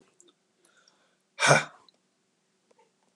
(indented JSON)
{
  "exhalation_length": "3.2 s",
  "exhalation_amplitude": 20391,
  "exhalation_signal_mean_std_ratio": 0.21,
  "survey_phase": "alpha (2021-03-01 to 2021-08-12)",
  "age": "65+",
  "gender": "Male",
  "wearing_mask": "No",
  "symptom_none": true,
  "smoker_status": "Never smoked",
  "respiratory_condition_asthma": false,
  "respiratory_condition_other": false,
  "recruitment_source": "REACT",
  "submission_delay": "1 day",
  "covid_test_result": "Negative",
  "covid_test_method": "RT-qPCR"
}